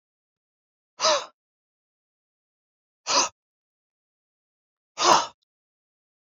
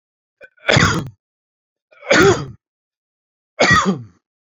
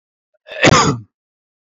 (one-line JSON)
{"exhalation_length": "6.2 s", "exhalation_amplitude": 21225, "exhalation_signal_mean_std_ratio": 0.25, "three_cough_length": "4.4 s", "three_cough_amplitude": 29299, "three_cough_signal_mean_std_ratio": 0.4, "cough_length": "1.8 s", "cough_amplitude": 30286, "cough_signal_mean_std_ratio": 0.37, "survey_phase": "beta (2021-08-13 to 2022-03-07)", "age": "45-64", "gender": "Male", "wearing_mask": "No", "symptom_none": true, "symptom_onset": "9 days", "smoker_status": "Never smoked", "respiratory_condition_asthma": false, "respiratory_condition_other": false, "recruitment_source": "REACT", "submission_delay": "1 day", "covid_test_result": "Negative", "covid_test_method": "RT-qPCR"}